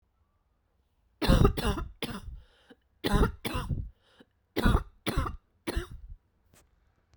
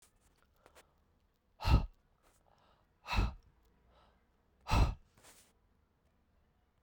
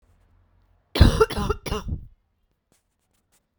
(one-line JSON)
{"three_cough_length": "7.2 s", "three_cough_amplitude": 12548, "three_cough_signal_mean_std_ratio": 0.4, "exhalation_length": "6.8 s", "exhalation_amplitude": 5773, "exhalation_signal_mean_std_ratio": 0.26, "cough_length": "3.6 s", "cough_amplitude": 32767, "cough_signal_mean_std_ratio": 0.3, "survey_phase": "beta (2021-08-13 to 2022-03-07)", "age": "45-64", "gender": "Female", "wearing_mask": "No", "symptom_cough_any": true, "symptom_runny_or_blocked_nose": true, "symptom_shortness_of_breath": true, "symptom_diarrhoea": true, "symptom_fatigue": true, "symptom_headache": true, "symptom_change_to_sense_of_smell_or_taste": true, "smoker_status": "Never smoked", "respiratory_condition_asthma": false, "respiratory_condition_other": false, "recruitment_source": "Test and Trace", "submission_delay": "2 days", "covid_test_result": "Positive", "covid_test_method": "RT-qPCR", "covid_ct_value": 16.1, "covid_ct_gene": "ORF1ab gene", "covid_ct_mean": 16.4, "covid_viral_load": "4300000 copies/ml", "covid_viral_load_category": "High viral load (>1M copies/ml)"}